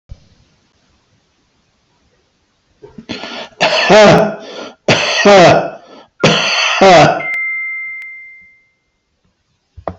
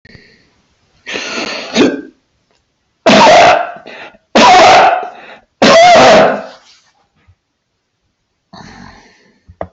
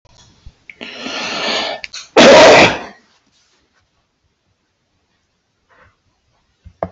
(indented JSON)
{
  "exhalation_length": "10.0 s",
  "exhalation_amplitude": 32767,
  "exhalation_signal_mean_std_ratio": 0.49,
  "three_cough_length": "9.7 s",
  "three_cough_amplitude": 32768,
  "three_cough_signal_mean_std_ratio": 0.51,
  "cough_length": "6.9 s",
  "cough_amplitude": 32768,
  "cough_signal_mean_std_ratio": 0.33,
  "survey_phase": "beta (2021-08-13 to 2022-03-07)",
  "age": "65+",
  "gender": "Male",
  "wearing_mask": "No",
  "symptom_runny_or_blocked_nose": true,
  "symptom_onset": "12 days",
  "smoker_status": "Ex-smoker",
  "respiratory_condition_asthma": false,
  "respiratory_condition_other": false,
  "recruitment_source": "REACT",
  "submission_delay": "1 day",
  "covid_test_result": "Negative",
  "covid_test_method": "RT-qPCR",
  "influenza_a_test_result": "Negative",
  "influenza_b_test_result": "Negative"
}